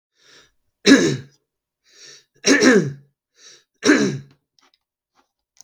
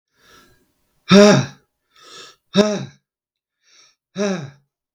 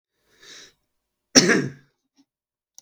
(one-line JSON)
{"three_cough_length": "5.6 s", "three_cough_amplitude": 32768, "three_cough_signal_mean_std_ratio": 0.34, "exhalation_length": "4.9 s", "exhalation_amplitude": 32768, "exhalation_signal_mean_std_ratio": 0.29, "cough_length": "2.8 s", "cough_amplitude": 32768, "cough_signal_mean_std_ratio": 0.24, "survey_phase": "beta (2021-08-13 to 2022-03-07)", "age": "45-64", "gender": "Male", "wearing_mask": "No", "symptom_cough_any": true, "symptom_runny_or_blocked_nose": true, "symptom_fatigue": true, "symptom_onset": "6 days", "smoker_status": "Ex-smoker", "respiratory_condition_asthma": false, "respiratory_condition_other": false, "recruitment_source": "REACT", "submission_delay": "1 day", "covid_test_result": "Negative", "covid_test_method": "RT-qPCR", "influenza_a_test_result": "Negative", "influenza_b_test_result": "Negative"}